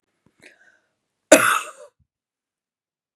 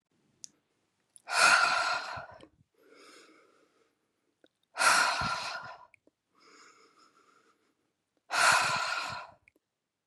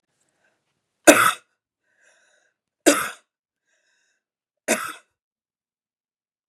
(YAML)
cough_length: 3.2 s
cough_amplitude: 32768
cough_signal_mean_std_ratio: 0.21
exhalation_length: 10.1 s
exhalation_amplitude: 10677
exhalation_signal_mean_std_ratio: 0.39
three_cough_length: 6.5 s
three_cough_amplitude: 32768
three_cough_signal_mean_std_ratio: 0.21
survey_phase: beta (2021-08-13 to 2022-03-07)
age: 45-64
gender: Female
wearing_mask: 'No'
symptom_none: true
smoker_status: Never smoked
respiratory_condition_asthma: false
respiratory_condition_other: false
recruitment_source: REACT
submission_delay: 2 days
covid_test_result: Negative
covid_test_method: RT-qPCR
influenza_a_test_result: Negative
influenza_b_test_result: Negative